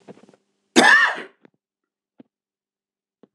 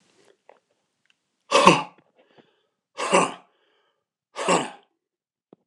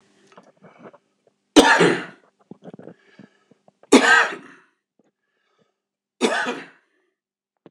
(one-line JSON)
{"cough_length": "3.3 s", "cough_amplitude": 26027, "cough_signal_mean_std_ratio": 0.28, "exhalation_length": "5.7 s", "exhalation_amplitude": 26028, "exhalation_signal_mean_std_ratio": 0.28, "three_cough_length": "7.7 s", "three_cough_amplitude": 26028, "three_cough_signal_mean_std_ratio": 0.29, "survey_phase": "beta (2021-08-13 to 2022-03-07)", "age": "45-64", "gender": "Male", "wearing_mask": "No", "symptom_cough_any": true, "symptom_onset": "3 days", "smoker_status": "Ex-smoker", "respiratory_condition_asthma": true, "respiratory_condition_other": false, "recruitment_source": "Test and Trace", "submission_delay": "2 days", "covid_test_result": "Positive", "covid_test_method": "RT-qPCR", "covid_ct_value": 14.8, "covid_ct_gene": "N gene"}